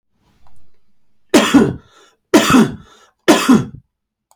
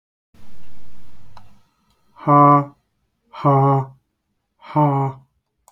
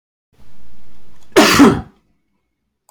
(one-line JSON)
{"three_cough_length": "4.4 s", "three_cough_amplitude": 32768, "three_cough_signal_mean_std_ratio": 0.42, "exhalation_length": "5.7 s", "exhalation_amplitude": 28191, "exhalation_signal_mean_std_ratio": 0.52, "cough_length": "2.9 s", "cough_amplitude": 32768, "cough_signal_mean_std_ratio": 0.49, "survey_phase": "beta (2021-08-13 to 2022-03-07)", "age": "45-64", "gender": "Male", "wearing_mask": "No", "symptom_none": true, "symptom_onset": "12 days", "smoker_status": "Never smoked", "respiratory_condition_asthma": false, "respiratory_condition_other": false, "recruitment_source": "REACT", "submission_delay": "2 days", "covid_test_result": "Negative", "covid_test_method": "RT-qPCR", "influenza_a_test_result": "Negative", "influenza_b_test_result": "Negative"}